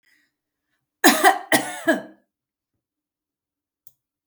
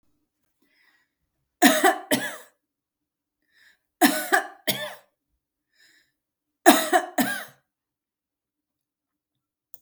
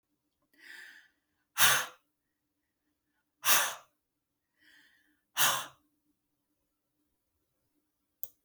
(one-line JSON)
{"cough_length": "4.3 s", "cough_amplitude": 32706, "cough_signal_mean_std_ratio": 0.28, "three_cough_length": "9.8 s", "three_cough_amplitude": 32652, "three_cough_signal_mean_std_ratio": 0.28, "exhalation_length": "8.4 s", "exhalation_amplitude": 12267, "exhalation_signal_mean_std_ratio": 0.24, "survey_phase": "beta (2021-08-13 to 2022-03-07)", "age": "65+", "gender": "Female", "wearing_mask": "No", "symptom_none": true, "smoker_status": "Never smoked", "respiratory_condition_asthma": false, "respiratory_condition_other": false, "recruitment_source": "REACT", "submission_delay": "1 day", "covid_test_result": "Negative", "covid_test_method": "RT-qPCR", "influenza_a_test_result": "Negative", "influenza_b_test_result": "Negative"}